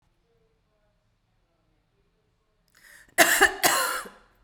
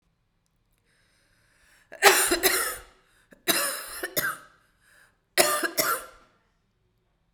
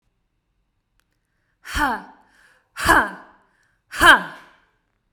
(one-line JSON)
{"cough_length": "4.4 s", "cough_amplitude": 25947, "cough_signal_mean_std_ratio": 0.3, "three_cough_length": "7.3 s", "three_cough_amplitude": 32767, "three_cough_signal_mean_std_ratio": 0.37, "exhalation_length": "5.1 s", "exhalation_amplitude": 32768, "exhalation_signal_mean_std_ratio": 0.29, "survey_phase": "beta (2021-08-13 to 2022-03-07)", "age": "18-44", "gender": "Female", "wearing_mask": "No", "symptom_fatigue": true, "symptom_headache": true, "symptom_other": true, "symptom_onset": "3 days", "smoker_status": "Ex-smoker", "respiratory_condition_asthma": true, "respiratory_condition_other": false, "recruitment_source": "Test and Trace", "submission_delay": "1 day", "covid_test_result": "Positive", "covid_test_method": "RT-qPCR", "covid_ct_value": 17.4, "covid_ct_gene": "N gene"}